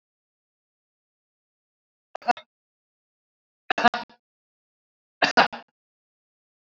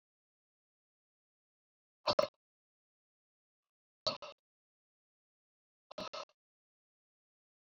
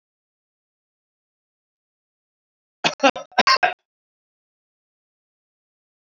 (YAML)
three_cough_length: 6.7 s
three_cough_amplitude: 28003
three_cough_signal_mean_std_ratio: 0.17
exhalation_length: 7.7 s
exhalation_amplitude: 5935
exhalation_signal_mean_std_ratio: 0.15
cough_length: 6.1 s
cough_amplitude: 27085
cough_signal_mean_std_ratio: 0.19
survey_phase: alpha (2021-03-01 to 2021-08-12)
age: 45-64
gender: Male
wearing_mask: 'No'
symptom_none: true
smoker_status: Current smoker (11 or more cigarettes per day)
respiratory_condition_asthma: false
respiratory_condition_other: false
recruitment_source: REACT
submission_delay: 4 days
covid_test_result: Negative
covid_test_method: RT-qPCR